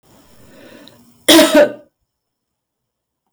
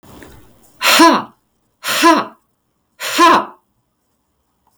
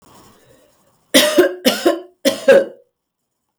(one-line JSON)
{"cough_length": "3.3 s", "cough_amplitude": 32768, "cough_signal_mean_std_ratio": 0.31, "exhalation_length": "4.8 s", "exhalation_amplitude": 32768, "exhalation_signal_mean_std_ratio": 0.42, "three_cough_length": "3.6 s", "three_cough_amplitude": 32768, "three_cough_signal_mean_std_ratio": 0.41, "survey_phase": "beta (2021-08-13 to 2022-03-07)", "age": "45-64", "gender": "Female", "wearing_mask": "No", "symptom_headache": true, "smoker_status": "Never smoked", "respiratory_condition_asthma": false, "respiratory_condition_other": false, "recruitment_source": "REACT", "submission_delay": "2 days", "covid_test_result": "Negative", "covid_test_method": "RT-qPCR", "influenza_a_test_result": "Negative", "influenza_b_test_result": "Negative"}